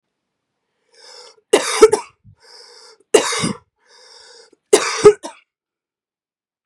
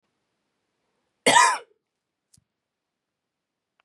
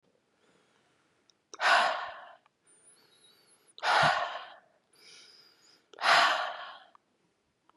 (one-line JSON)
{"three_cough_length": "6.7 s", "three_cough_amplitude": 32768, "three_cough_signal_mean_std_ratio": 0.27, "cough_length": "3.8 s", "cough_amplitude": 21790, "cough_signal_mean_std_ratio": 0.22, "exhalation_length": "7.8 s", "exhalation_amplitude": 9330, "exhalation_signal_mean_std_ratio": 0.36, "survey_phase": "beta (2021-08-13 to 2022-03-07)", "age": "18-44", "gender": "Female", "wearing_mask": "No", "symptom_cough_any": true, "symptom_shortness_of_breath": true, "symptom_fatigue": true, "symptom_onset": "12 days", "smoker_status": "Never smoked", "respiratory_condition_asthma": false, "respiratory_condition_other": false, "recruitment_source": "REACT", "submission_delay": "0 days", "covid_test_result": "Negative", "covid_test_method": "RT-qPCR", "influenza_a_test_result": "Negative", "influenza_b_test_result": "Negative"}